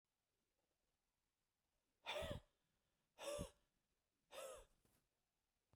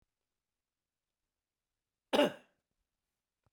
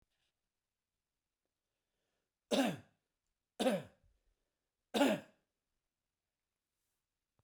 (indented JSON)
{
  "exhalation_length": "5.8 s",
  "exhalation_amplitude": 576,
  "exhalation_signal_mean_std_ratio": 0.33,
  "cough_length": "3.5 s",
  "cough_amplitude": 5240,
  "cough_signal_mean_std_ratio": 0.17,
  "three_cough_length": "7.4 s",
  "three_cough_amplitude": 3755,
  "three_cough_signal_mean_std_ratio": 0.24,
  "survey_phase": "beta (2021-08-13 to 2022-03-07)",
  "age": "65+",
  "gender": "Male",
  "wearing_mask": "No",
  "symptom_none": true,
  "smoker_status": "Never smoked",
  "respiratory_condition_asthma": false,
  "respiratory_condition_other": false,
  "recruitment_source": "REACT",
  "submission_delay": "2 days",
  "covid_test_result": "Negative",
  "covid_test_method": "RT-qPCR"
}